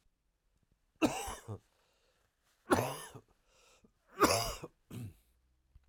{"three_cough_length": "5.9 s", "three_cough_amplitude": 6732, "three_cough_signal_mean_std_ratio": 0.31, "survey_phase": "alpha (2021-03-01 to 2021-08-12)", "age": "45-64", "gender": "Male", "wearing_mask": "No", "symptom_shortness_of_breath": true, "symptom_fatigue": true, "symptom_headache": true, "symptom_loss_of_taste": true, "symptom_onset": "6 days", "smoker_status": "Never smoked", "respiratory_condition_asthma": false, "respiratory_condition_other": false, "recruitment_source": "Test and Trace", "submission_delay": "1 day", "covid_test_result": "Positive", "covid_test_method": "RT-qPCR", "covid_ct_value": 14.8, "covid_ct_gene": "ORF1ab gene", "covid_ct_mean": 15.7, "covid_viral_load": "6900000 copies/ml", "covid_viral_load_category": "High viral load (>1M copies/ml)"}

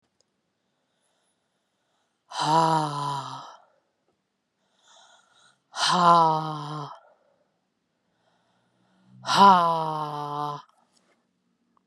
{"exhalation_length": "11.9 s", "exhalation_amplitude": 24011, "exhalation_signal_mean_std_ratio": 0.35, "survey_phase": "beta (2021-08-13 to 2022-03-07)", "age": "45-64", "gender": "Female", "wearing_mask": "No", "symptom_cough_any": true, "symptom_runny_or_blocked_nose": true, "symptom_fatigue": true, "symptom_fever_high_temperature": true, "symptom_headache": true, "symptom_change_to_sense_of_smell_or_taste": true, "symptom_loss_of_taste": true, "symptom_other": true, "smoker_status": "Never smoked", "respiratory_condition_asthma": false, "respiratory_condition_other": false, "recruitment_source": "Test and Trace", "submission_delay": "2 days", "covid_test_result": "Positive", "covid_test_method": "RT-qPCR", "covid_ct_value": 19.3, "covid_ct_gene": "N gene"}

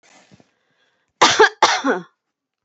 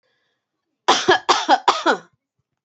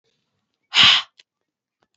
{"cough_length": "2.6 s", "cough_amplitude": 30743, "cough_signal_mean_std_ratio": 0.36, "three_cough_length": "2.6 s", "three_cough_amplitude": 28257, "three_cough_signal_mean_std_ratio": 0.41, "exhalation_length": "2.0 s", "exhalation_amplitude": 28465, "exhalation_signal_mean_std_ratio": 0.29, "survey_phase": "beta (2021-08-13 to 2022-03-07)", "age": "45-64", "gender": "Female", "wearing_mask": "No", "symptom_none": true, "symptom_onset": "4 days", "smoker_status": "Never smoked", "respiratory_condition_asthma": false, "respiratory_condition_other": false, "recruitment_source": "REACT", "submission_delay": "1 day", "covid_test_result": "Negative", "covid_test_method": "RT-qPCR"}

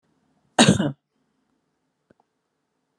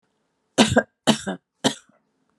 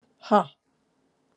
{"cough_length": "3.0 s", "cough_amplitude": 31247, "cough_signal_mean_std_ratio": 0.23, "three_cough_length": "2.4 s", "three_cough_amplitude": 31994, "three_cough_signal_mean_std_ratio": 0.32, "exhalation_length": "1.4 s", "exhalation_amplitude": 15587, "exhalation_signal_mean_std_ratio": 0.24, "survey_phase": "alpha (2021-03-01 to 2021-08-12)", "age": "65+", "gender": "Female", "wearing_mask": "No", "symptom_none": true, "smoker_status": "Never smoked", "respiratory_condition_asthma": false, "respiratory_condition_other": false, "recruitment_source": "REACT", "submission_delay": "1 day", "covid_test_result": "Negative", "covid_test_method": "RT-qPCR", "covid_ct_value": 42.0, "covid_ct_gene": "N gene"}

